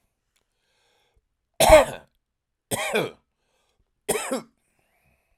{"three_cough_length": "5.4 s", "three_cough_amplitude": 32768, "three_cough_signal_mean_std_ratio": 0.26, "survey_phase": "alpha (2021-03-01 to 2021-08-12)", "age": "45-64", "gender": "Male", "wearing_mask": "No", "symptom_fatigue": true, "symptom_headache": true, "symptom_onset": "6 days", "smoker_status": "Ex-smoker", "respiratory_condition_asthma": false, "respiratory_condition_other": false, "recruitment_source": "REACT", "submission_delay": "2 days", "covid_test_result": "Negative", "covid_test_method": "RT-qPCR"}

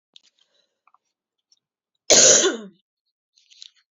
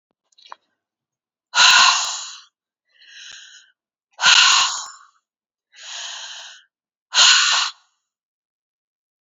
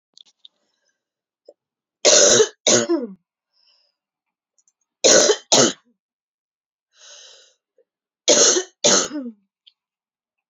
{"cough_length": "3.9 s", "cough_amplitude": 32767, "cough_signal_mean_std_ratio": 0.27, "exhalation_length": "9.2 s", "exhalation_amplitude": 32350, "exhalation_signal_mean_std_ratio": 0.36, "three_cough_length": "10.5 s", "three_cough_amplitude": 32768, "three_cough_signal_mean_std_ratio": 0.34, "survey_phase": "beta (2021-08-13 to 2022-03-07)", "age": "18-44", "gender": "Female", "wearing_mask": "No", "symptom_cough_any": true, "symptom_runny_or_blocked_nose": true, "symptom_shortness_of_breath": true, "symptom_sore_throat": true, "symptom_change_to_sense_of_smell_or_taste": true, "symptom_loss_of_taste": true, "symptom_onset": "3 days", "smoker_status": "Current smoker (e-cigarettes or vapes only)", "respiratory_condition_asthma": false, "respiratory_condition_other": false, "recruitment_source": "Test and Trace", "submission_delay": "2 days", "covid_test_result": "Positive", "covid_test_method": "ePCR"}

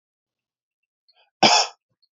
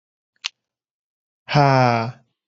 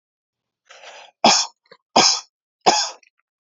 {"cough_length": "2.1 s", "cough_amplitude": 29026, "cough_signal_mean_std_ratio": 0.26, "exhalation_length": "2.5 s", "exhalation_amplitude": 29309, "exhalation_signal_mean_std_ratio": 0.35, "three_cough_length": "3.5 s", "three_cough_amplitude": 30565, "three_cough_signal_mean_std_ratio": 0.34, "survey_phase": "beta (2021-08-13 to 2022-03-07)", "age": "18-44", "gender": "Male", "wearing_mask": "No", "symptom_cough_any": true, "symptom_shortness_of_breath": true, "symptom_onset": "12 days", "smoker_status": "Never smoked", "respiratory_condition_asthma": true, "respiratory_condition_other": false, "recruitment_source": "REACT", "submission_delay": "2 days", "covid_test_result": "Negative", "covid_test_method": "RT-qPCR", "influenza_a_test_result": "Negative", "influenza_b_test_result": "Negative"}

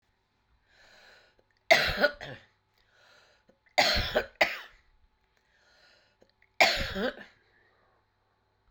{"three_cough_length": "8.7 s", "three_cough_amplitude": 16280, "three_cough_signal_mean_std_ratio": 0.3, "survey_phase": "alpha (2021-03-01 to 2021-08-12)", "age": "65+", "gender": "Female", "wearing_mask": "No", "symptom_cough_any": true, "symptom_shortness_of_breath": true, "symptom_diarrhoea": true, "symptom_fatigue": true, "symptom_fever_high_temperature": true, "symptom_headache": true, "smoker_status": "Never smoked", "respiratory_condition_asthma": false, "respiratory_condition_other": false, "recruitment_source": "Test and Trace", "submission_delay": "3 days", "covid_test_result": "Positive", "covid_test_method": "LFT"}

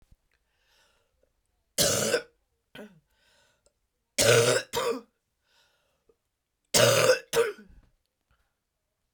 {"three_cough_length": "9.1 s", "three_cough_amplitude": 18572, "three_cough_signal_mean_std_ratio": 0.35, "survey_phase": "beta (2021-08-13 to 2022-03-07)", "age": "45-64", "gender": "Female", "wearing_mask": "No", "symptom_cough_any": true, "symptom_new_continuous_cough": true, "symptom_runny_or_blocked_nose": true, "symptom_sore_throat": true, "symptom_abdominal_pain": true, "symptom_fatigue": true, "symptom_headache": true, "symptom_other": true, "smoker_status": "Never smoked", "respiratory_condition_asthma": false, "respiratory_condition_other": false, "recruitment_source": "Test and Trace", "submission_delay": "3 days", "covid_test_result": "Positive", "covid_test_method": "RT-qPCR", "covid_ct_value": 20.6, "covid_ct_gene": "N gene"}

